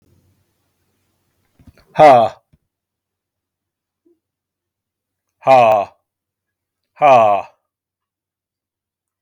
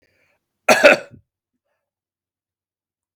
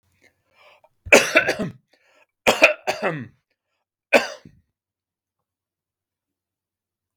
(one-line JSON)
{"exhalation_length": "9.2 s", "exhalation_amplitude": 32768, "exhalation_signal_mean_std_ratio": 0.28, "cough_length": "3.2 s", "cough_amplitude": 32768, "cough_signal_mean_std_ratio": 0.22, "three_cough_length": "7.2 s", "three_cough_amplitude": 32768, "three_cough_signal_mean_std_ratio": 0.26, "survey_phase": "beta (2021-08-13 to 2022-03-07)", "age": "45-64", "gender": "Male", "wearing_mask": "No", "symptom_none": true, "smoker_status": "Never smoked", "respiratory_condition_asthma": false, "respiratory_condition_other": false, "recruitment_source": "Test and Trace", "submission_delay": "1 day", "covid_test_result": "Negative", "covid_test_method": "RT-qPCR"}